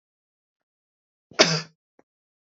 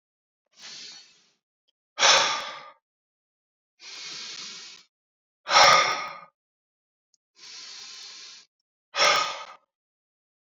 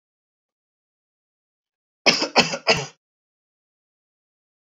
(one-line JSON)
{"cough_length": "2.6 s", "cough_amplitude": 26866, "cough_signal_mean_std_ratio": 0.2, "exhalation_length": "10.5 s", "exhalation_amplitude": 25093, "exhalation_signal_mean_std_ratio": 0.31, "three_cough_length": "4.6 s", "three_cough_amplitude": 31030, "three_cough_signal_mean_std_ratio": 0.24, "survey_phase": "beta (2021-08-13 to 2022-03-07)", "age": "18-44", "gender": "Male", "wearing_mask": "No", "symptom_none": true, "smoker_status": "Never smoked", "respiratory_condition_asthma": false, "respiratory_condition_other": false, "recruitment_source": "REACT", "submission_delay": "1 day", "covid_test_result": "Negative", "covid_test_method": "RT-qPCR", "influenza_a_test_result": "Negative", "influenza_b_test_result": "Negative"}